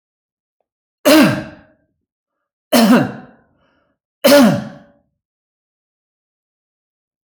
{
  "three_cough_length": "7.3 s",
  "three_cough_amplitude": 29259,
  "three_cough_signal_mean_std_ratio": 0.33,
  "survey_phase": "alpha (2021-03-01 to 2021-08-12)",
  "age": "45-64",
  "gender": "Male",
  "wearing_mask": "No",
  "symptom_none": true,
  "smoker_status": "Never smoked",
  "respiratory_condition_asthma": false,
  "respiratory_condition_other": false,
  "recruitment_source": "REACT",
  "submission_delay": "1 day",
  "covid_test_result": "Negative",
  "covid_test_method": "RT-qPCR"
}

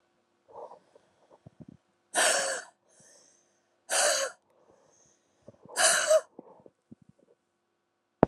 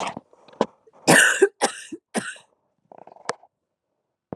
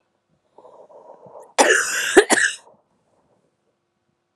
{
  "exhalation_length": "8.3 s",
  "exhalation_amplitude": 26654,
  "exhalation_signal_mean_std_ratio": 0.32,
  "three_cough_length": "4.4 s",
  "three_cough_amplitude": 28638,
  "three_cough_signal_mean_std_ratio": 0.31,
  "cough_length": "4.4 s",
  "cough_amplitude": 32767,
  "cough_signal_mean_std_ratio": 0.32,
  "survey_phase": "beta (2021-08-13 to 2022-03-07)",
  "age": "18-44",
  "gender": "Female",
  "wearing_mask": "No",
  "symptom_cough_any": true,
  "symptom_runny_or_blocked_nose": true,
  "symptom_sore_throat": true,
  "symptom_onset": "3 days",
  "smoker_status": "Ex-smoker",
  "respiratory_condition_asthma": false,
  "respiratory_condition_other": false,
  "recruitment_source": "Test and Trace",
  "submission_delay": "2 days",
  "covid_test_result": "Positive",
  "covid_test_method": "RT-qPCR",
  "covid_ct_value": 34.9,
  "covid_ct_gene": "N gene"
}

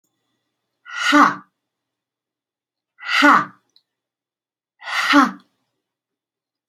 {
  "exhalation_length": "6.7 s",
  "exhalation_amplitude": 28904,
  "exhalation_signal_mean_std_ratio": 0.31,
  "survey_phase": "beta (2021-08-13 to 2022-03-07)",
  "age": "45-64",
  "gender": "Female",
  "wearing_mask": "No",
  "symptom_cough_any": true,
  "symptom_onset": "5 days",
  "smoker_status": "Never smoked",
  "respiratory_condition_asthma": false,
  "respiratory_condition_other": false,
  "recruitment_source": "REACT",
  "submission_delay": "2 days",
  "covid_test_result": "Negative",
  "covid_test_method": "RT-qPCR",
  "influenza_a_test_result": "Negative",
  "influenza_b_test_result": "Negative"
}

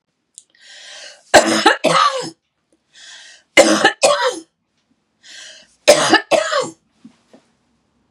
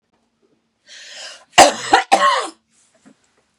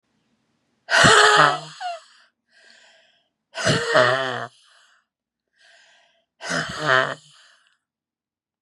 {
  "three_cough_length": "8.1 s",
  "three_cough_amplitude": 32768,
  "three_cough_signal_mean_std_ratio": 0.4,
  "cough_length": "3.6 s",
  "cough_amplitude": 32768,
  "cough_signal_mean_std_ratio": 0.33,
  "exhalation_length": "8.6 s",
  "exhalation_amplitude": 30830,
  "exhalation_signal_mean_std_ratio": 0.37,
  "survey_phase": "beta (2021-08-13 to 2022-03-07)",
  "age": "65+",
  "gender": "Female",
  "wearing_mask": "No",
  "symptom_none": true,
  "smoker_status": "Never smoked",
  "respiratory_condition_asthma": false,
  "respiratory_condition_other": false,
  "recruitment_source": "REACT",
  "submission_delay": "3 days",
  "covid_test_result": "Negative",
  "covid_test_method": "RT-qPCR",
  "influenza_a_test_result": "Negative",
  "influenza_b_test_result": "Negative"
}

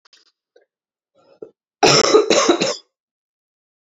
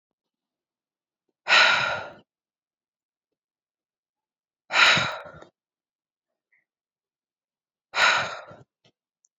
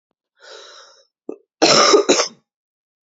{
  "three_cough_length": "3.8 s",
  "three_cough_amplitude": 32768,
  "three_cough_signal_mean_std_ratio": 0.37,
  "exhalation_length": "9.4 s",
  "exhalation_amplitude": 23586,
  "exhalation_signal_mean_std_ratio": 0.29,
  "cough_length": "3.1 s",
  "cough_amplitude": 30716,
  "cough_signal_mean_std_ratio": 0.37,
  "survey_phase": "beta (2021-08-13 to 2022-03-07)",
  "age": "18-44",
  "gender": "Female",
  "wearing_mask": "No",
  "symptom_cough_any": true,
  "symptom_new_continuous_cough": true,
  "symptom_runny_or_blocked_nose": true,
  "symptom_sore_throat": true,
  "symptom_onset": "3 days",
  "smoker_status": "Never smoked",
  "respiratory_condition_asthma": false,
  "respiratory_condition_other": false,
  "recruitment_source": "Test and Trace",
  "submission_delay": "2 days",
  "covid_test_result": "Positive",
  "covid_test_method": "RT-qPCR",
  "covid_ct_value": 21.1,
  "covid_ct_gene": "N gene"
}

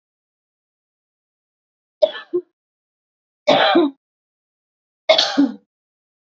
{
  "three_cough_length": "6.3 s",
  "three_cough_amplitude": 29858,
  "three_cough_signal_mean_std_ratio": 0.31,
  "survey_phase": "beta (2021-08-13 to 2022-03-07)",
  "age": "45-64",
  "gender": "Female",
  "wearing_mask": "No",
  "symptom_none": true,
  "smoker_status": "Current smoker (1 to 10 cigarettes per day)",
  "respiratory_condition_asthma": false,
  "respiratory_condition_other": false,
  "recruitment_source": "REACT",
  "submission_delay": "0 days",
  "covid_test_result": "Negative",
  "covid_test_method": "RT-qPCR",
  "influenza_a_test_result": "Unknown/Void",
  "influenza_b_test_result": "Unknown/Void"
}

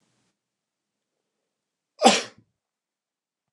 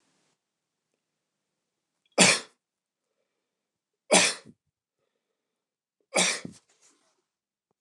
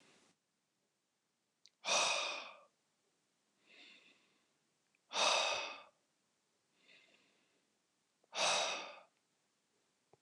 {
  "cough_length": "3.5 s",
  "cough_amplitude": 28694,
  "cough_signal_mean_std_ratio": 0.17,
  "three_cough_length": "7.8 s",
  "three_cough_amplitude": 25119,
  "three_cough_signal_mean_std_ratio": 0.22,
  "exhalation_length": "10.2 s",
  "exhalation_amplitude": 3401,
  "exhalation_signal_mean_std_ratio": 0.34,
  "survey_phase": "beta (2021-08-13 to 2022-03-07)",
  "age": "45-64",
  "gender": "Male",
  "wearing_mask": "No",
  "symptom_none": true,
  "smoker_status": "Never smoked",
  "respiratory_condition_asthma": false,
  "respiratory_condition_other": false,
  "recruitment_source": "REACT",
  "submission_delay": "3 days",
  "covid_test_result": "Negative",
  "covid_test_method": "RT-qPCR",
  "influenza_a_test_result": "Negative",
  "influenza_b_test_result": "Negative"
}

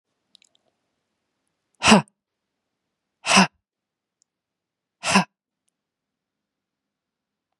{
  "exhalation_length": "7.6 s",
  "exhalation_amplitude": 32035,
  "exhalation_signal_mean_std_ratio": 0.2,
  "survey_phase": "beta (2021-08-13 to 2022-03-07)",
  "age": "45-64",
  "gender": "Female",
  "wearing_mask": "No",
  "symptom_none": true,
  "smoker_status": "Never smoked",
  "respiratory_condition_asthma": false,
  "respiratory_condition_other": false,
  "recruitment_source": "REACT",
  "submission_delay": "1 day",
  "covid_test_result": "Negative",
  "covid_test_method": "RT-qPCR",
  "influenza_a_test_result": "Negative",
  "influenza_b_test_result": "Negative"
}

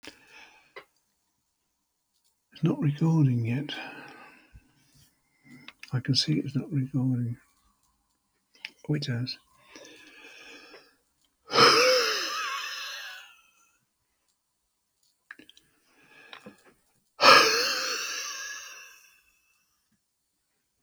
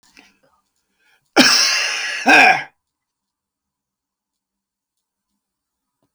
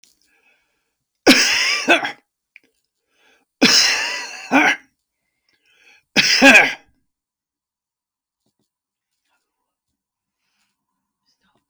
{
  "exhalation_length": "20.8 s",
  "exhalation_amplitude": 24376,
  "exhalation_signal_mean_std_ratio": 0.38,
  "cough_length": "6.1 s",
  "cough_amplitude": 32471,
  "cough_signal_mean_std_ratio": 0.32,
  "three_cough_length": "11.7 s",
  "three_cough_amplitude": 32608,
  "three_cough_signal_mean_std_ratio": 0.32,
  "survey_phase": "alpha (2021-03-01 to 2021-08-12)",
  "age": "65+",
  "gender": "Male",
  "wearing_mask": "No",
  "symptom_none": true,
  "smoker_status": "Ex-smoker",
  "respiratory_condition_asthma": false,
  "respiratory_condition_other": false,
  "recruitment_source": "REACT",
  "submission_delay": "1 day",
  "covid_test_result": "Negative",
  "covid_test_method": "RT-qPCR"
}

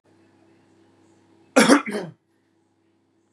{
  "cough_length": "3.3 s",
  "cough_amplitude": 31008,
  "cough_signal_mean_std_ratio": 0.25,
  "survey_phase": "beta (2021-08-13 to 2022-03-07)",
  "age": "18-44",
  "gender": "Male",
  "wearing_mask": "No",
  "symptom_cough_any": true,
  "symptom_runny_or_blocked_nose": true,
  "symptom_onset": "10 days",
  "smoker_status": "Never smoked",
  "respiratory_condition_asthma": false,
  "respiratory_condition_other": false,
  "recruitment_source": "REACT",
  "submission_delay": "2 days",
  "covid_test_result": "Negative",
  "covid_test_method": "RT-qPCR",
  "influenza_a_test_result": "Negative",
  "influenza_b_test_result": "Negative"
}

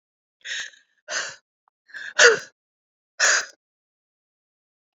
{
  "exhalation_length": "4.9 s",
  "exhalation_amplitude": 28733,
  "exhalation_signal_mean_std_ratio": 0.27,
  "survey_phase": "beta (2021-08-13 to 2022-03-07)",
  "age": "45-64",
  "gender": "Female",
  "wearing_mask": "No",
  "symptom_cough_any": true,
  "symptom_new_continuous_cough": true,
  "symptom_runny_or_blocked_nose": true,
  "symptom_diarrhoea": true,
  "symptom_change_to_sense_of_smell_or_taste": true,
  "symptom_loss_of_taste": true,
  "symptom_onset": "4 days",
  "smoker_status": "Ex-smoker",
  "respiratory_condition_asthma": false,
  "respiratory_condition_other": false,
  "recruitment_source": "Test and Trace",
  "submission_delay": "1 day",
  "covid_test_result": "Positive",
  "covid_test_method": "RT-qPCR",
  "covid_ct_value": 13.2,
  "covid_ct_gene": "ORF1ab gene",
  "covid_ct_mean": 13.8,
  "covid_viral_load": "31000000 copies/ml",
  "covid_viral_load_category": "High viral load (>1M copies/ml)"
}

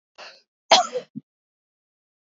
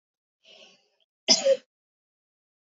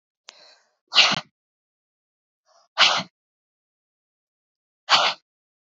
{
  "cough_length": "2.4 s",
  "cough_amplitude": 25753,
  "cough_signal_mean_std_ratio": 0.22,
  "three_cough_length": "2.6 s",
  "three_cough_amplitude": 18697,
  "three_cough_signal_mean_std_ratio": 0.24,
  "exhalation_length": "5.7 s",
  "exhalation_amplitude": 25257,
  "exhalation_signal_mean_std_ratio": 0.26,
  "survey_phase": "beta (2021-08-13 to 2022-03-07)",
  "age": "45-64",
  "gender": "Female",
  "wearing_mask": "No",
  "symptom_none": true,
  "smoker_status": "Ex-smoker",
  "respiratory_condition_asthma": false,
  "respiratory_condition_other": false,
  "recruitment_source": "REACT",
  "submission_delay": "1 day",
  "covid_test_result": "Negative",
  "covid_test_method": "RT-qPCR",
  "influenza_a_test_result": "Negative",
  "influenza_b_test_result": "Negative"
}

